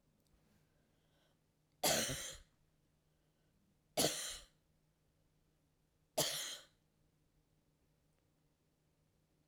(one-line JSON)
{"three_cough_length": "9.5 s", "three_cough_amplitude": 3421, "three_cough_signal_mean_std_ratio": 0.28, "survey_phase": "alpha (2021-03-01 to 2021-08-12)", "age": "45-64", "gender": "Female", "wearing_mask": "No", "symptom_none": true, "smoker_status": "Never smoked", "respiratory_condition_asthma": false, "respiratory_condition_other": false, "recruitment_source": "REACT", "submission_delay": "2 days", "covid_test_result": "Negative", "covid_test_method": "RT-qPCR"}